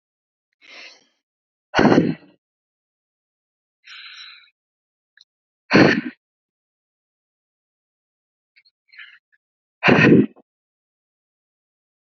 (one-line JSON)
{"exhalation_length": "12.0 s", "exhalation_amplitude": 28226, "exhalation_signal_mean_std_ratio": 0.24, "survey_phase": "beta (2021-08-13 to 2022-03-07)", "age": "18-44", "gender": "Female", "wearing_mask": "No", "symptom_none": true, "smoker_status": "Current smoker (1 to 10 cigarettes per day)", "respiratory_condition_asthma": true, "respiratory_condition_other": false, "recruitment_source": "REACT", "submission_delay": "4 days", "covid_test_result": "Negative", "covid_test_method": "RT-qPCR"}